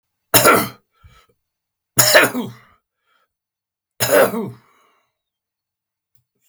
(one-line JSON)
{"three_cough_length": "6.5 s", "three_cough_amplitude": 32768, "three_cough_signal_mean_std_ratio": 0.32, "survey_phase": "alpha (2021-03-01 to 2021-08-12)", "age": "65+", "gender": "Male", "wearing_mask": "No", "symptom_none": true, "smoker_status": "Never smoked", "respiratory_condition_asthma": false, "respiratory_condition_other": false, "recruitment_source": "REACT", "submission_delay": "2 days", "covid_test_result": "Negative", "covid_test_method": "RT-qPCR"}